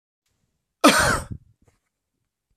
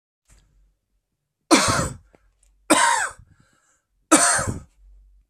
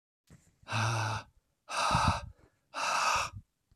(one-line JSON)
{"cough_length": "2.6 s", "cough_amplitude": 26030, "cough_signal_mean_std_ratio": 0.29, "three_cough_length": "5.3 s", "three_cough_amplitude": 32767, "three_cough_signal_mean_std_ratio": 0.37, "exhalation_length": "3.8 s", "exhalation_amplitude": 5825, "exhalation_signal_mean_std_ratio": 0.59, "survey_phase": "beta (2021-08-13 to 2022-03-07)", "age": "18-44", "gender": "Male", "wearing_mask": "No", "symptom_cough_any": true, "symptom_runny_or_blocked_nose": true, "symptom_sore_throat": true, "symptom_fatigue": true, "symptom_change_to_sense_of_smell_or_taste": true, "symptom_onset": "5 days", "smoker_status": "Never smoked", "respiratory_condition_asthma": false, "respiratory_condition_other": false, "recruitment_source": "Test and Trace", "submission_delay": "2 days", "covid_test_result": "Positive", "covid_test_method": "RT-qPCR", "covid_ct_value": 29.9, "covid_ct_gene": "N gene", "covid_ct_mean": 29.9, "covid_viral_load": "150 copies/ml", "covid_viral_load_category": "Minimal viral load (< 10K copies/ml)"}